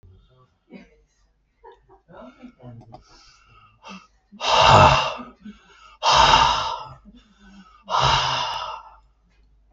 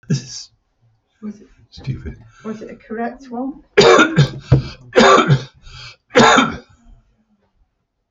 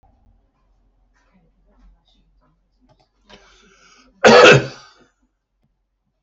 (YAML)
exhalation_length: 9.7 s
exhalation_amplitude: 32768
exhalation_signal_mean_std_ratio: 0.38
three_cough_length: 8.1 s
three_cough_amplitude: 32768
three_cough_signal_mean_std_ratio: 0.41
cough_length: 6.2 s
cough_amplitude: 32768
cough_signal_mean_std_ratio: 0.22
survey_phase: beta (2021-08-13 to 2022-03-07)
age: 65+
gender: Male
wearing_mask: 'No'
symptom_none: true
smoker_status: Never smoked
respiratory_condition_asthma: false
respiratory_condition_other: false
recruitment_source: REACT
submission_delay: 1 day
covid_test_result: Negative
covid_test_method: RT-qPCR
influenza_a_test_result: Negative
influenza_b_test_result: Negative